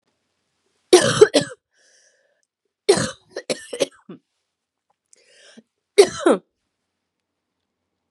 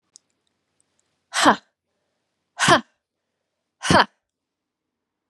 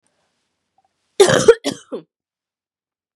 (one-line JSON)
{"three_cough_length": "8.1 s", "three_cough_amplitude": 32768, "three_cough_signal_mean_std_ratio": 0.25, "exhalation_length": "5.3 s", "exhalation_amplitude": 31325, "exhalation_signal_mean_std_ratio": 0.25, "cough_length": "3.2 s", "cough_amplitude": 32768, "cough_signal_mean_std_ratio": 0.25, "survey_phase": "beta (2021-08-13 to 2022-03-07)", "age": "18-44", "gender": "Female", "wearing_mask": "No", "symptom_cough_any": true, "symptom_runny_or_blocked_nose": true, "symptom_headache": true, "smoker_status": "Never smoked", "respiratory_condition_asthma": false, "respiratory_condition_other": false, "recruitment_source": "Test and Trace", "submission_delay": "2 days", "covid_test_result": "Positive", "covid_test_method": "RT-qPCR", "covid_ct_value": 25.9, "covid_ct_gene": "ORF1ab gene"}